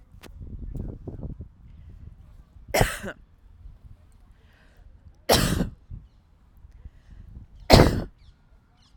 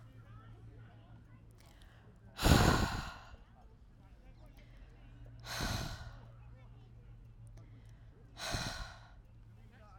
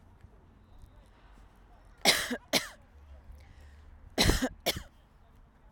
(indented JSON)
{
  "three_cough_length": "9.0 s",
  "three_cough_amplitude": 32767,
  "three_cough_signal_mean_std_ratio": 0.31,
  "exhalation_length": "10.0 s",
  "exhalation_amplitude": 8682,
  "exhalation_signal_mean_std_ratio": 0.38,
  "cough_length": "5.7 s",
  "cough_amplitude": 13137,
  "cough_signal_mean_std_ratio": 0.34,
  "survey_phase": "alpha (2021-03-01 to 2021-08-12)",
  "age": "18-44",
  "gender": "Female",
  "wearing_mask": "No",
  "symptom_none": true,
  "smoker_status": "Never smoked",
  "respiratory_condition_asthma": false,
  "respiratory_condition_other": false,
  "recruitment_source": "REACT",
  "submission_delay": "2 days",
  "covid_test_result": "Negative",
  "covid_test_method": "RT-qPCR"
}